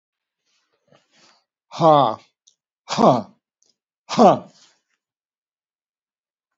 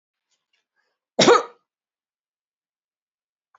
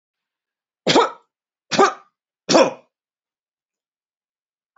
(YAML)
exhalation_length: 6.6 s
exhalation_amplitude: 27559
exhalation_signal_mean_std_ratio: 0.27
cough_length: 3.6 s
cough_amplitude: 27590
cough_signal_mean_std_ratio: 0.19
three_cough_length: 4.8 s
three_cough_amplitude: 32767
three_cough_signal_mean_std_ratio: 0.28
survey_phase: beta (2021-08-13 to 2022-03-07)
age: 65+
gender: Male
wearing_mask: 'No'
symptom_runny_or_blocked_nose: true
symptom_headache: true
symptom_onset: 2 days
smoker_status: Never smoked
respiratory_condition_asthma: false
respiratory_condition_other: false
recruitment_source: Test and Trace
submission_delay: 1 day
covid_test_result: Positive
covid_test_method: RT-qPCR